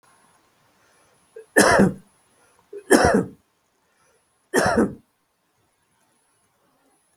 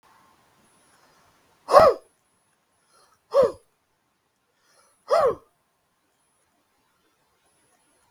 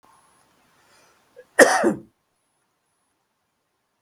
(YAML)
three_cough_length: 7.2 s
three_cough_amplitude: 32766
three_cough_signal_mean_std_ratio: 0.31
exhalation_length: 8.1 s
exhalation_amplitude: 32766
exhalation_signal_mean_std_ratio: 0.22
cough_length: 4.0 s
cough_amplitude: 32768
cough_signal_mean_std_ratio: 0.22
survey_phase: beta (2021-08-13 to 2022-03-07)
age: 65+
gender: Male
wearing_mask: 'No'
symptom_none: true
smoker_status: Ex-smoker
respiratory_condition_asthma: false
respiratory_condition_other: false
recruitment_source: REACT
submission_delay: 2 days
covid_test_result: Negative
covid_test_method: RT-qPCR
influenza_a_test_result: Negative
influenza_b_test_result: Negative